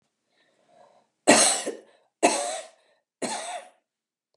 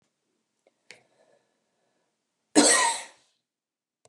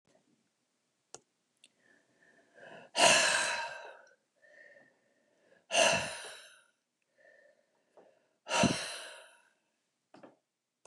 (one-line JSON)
{"three_cough_length": "4.4 s", "three_cough_amplitude": 28012, "three_cough_signal_mean_std_ratio": 0.34, "cough_length": "4.1 s", "cough_amplitude": 25669, "cough_signal_mean_std_ratio": 0.25, "exhalation_length": "10.9 s", "exhalation_amplitude": 10629, "exhalation_signal_mean_std_ratio": 0.31, "survey_phase": "beta (2021-08-13 to 2022-03-07)", "age": "65+", "gender": "Female", "wearing_mask": "No", "symptom_none": true, "smoker_status": "Never smoked", "respiratory_condition_asthma": false, "respiratory_condition_other": false, "recruitment_source": "REACT", "submission_delay": "1 day", "covid_test_result": "Negative", "covid_test_method": "RT-qPCR", "influenza_a_test_result": "Negative", "influenza_b_test_result": "Negative"}